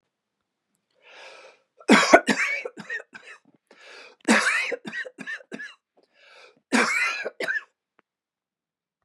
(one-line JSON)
{"three_cough_length": "9.0 s", "three_cough_amplitude": 32767, "three_cough_signal_mean_std_ratio": 0.35, "survey_phase": "beta (2021-08-13 to 2022-03-07)", "age": "45-64", "gender": "Male", "wearing_mask": "No", "symptom_none": true, "smoker_status": "Never smoked", "respiratory_condition_asthma": false, "respiratory_condition_other": false, "recruitment_source": "REACT", "submission_delay": "2 days", "covid_test_result": "Negative", "covid_test_method": "RT-qPCR", "influenza_a_test_result": "Unknown/Void", "influenza_b_test_result": "Unknown/Void"}